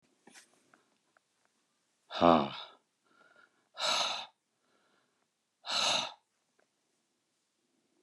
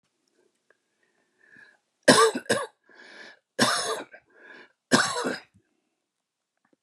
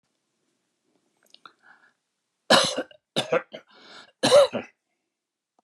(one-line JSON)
{"exhalation_length": "8.0 s", "exhalation_amplitude": 11501, "exhalation_signal_mean_std_ratio": 0.27, "three_cough_length": "6.8 s", "three_cough_amplitude": 25664, "three_cough_signal_mean_std_ratio": 0.31, "cough_length": "5.6 s", "cough_amplitude": 20723, "cough_signal_mean_std_ratio": 0.28, "survey_phase": "beta (2021-08-13 to 2022-03-07)", "age": "65+", "gender": "Male", "wearing_mask": "No", "symptom_none": true, "smoker_status": "Ex-smoker", "respiratory_condition_asthma": false, "respiratory_condition_other": false, "recruitment_source": "REACT", "submission_delay": "2 days", "covid_test_result": "Negative", "covid_test_method": "RT-qPCR"}